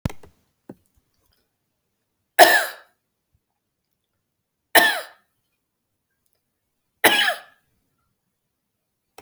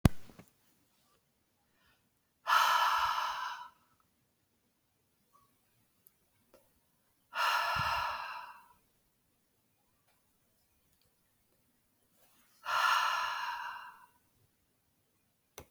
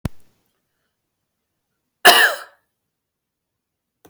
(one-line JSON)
{"three_cough_length": "9.2 s", "three_cough_amplitude": 32768, "three_cough_signal_mean_std_ratio": 0.22, "exhalation_length": "15.7 s", "exhalation_amplitude": 14733, "exhalation_signal_mean_std_ratio": 0.36, "cough_length": "4.1 s", "cough_amplitude": 32768, "cough_signal_mean_std_ratio": 0.22, "survey_phase": "alpha (2021-03-01 to 2021-08-12)", "age": "45-64", "gender": "Female", "wearing_mask": "No", "symptom_none": true, "smoker_status": "Ex-smoker", "respiratory_condition_asthma": false, "respiratory_condition_other": false, "recruitment_source": "REACT", "submission_delay": "1 day", "covid_test_result": "Negative", "covid_test_method": "RT-qPCR"}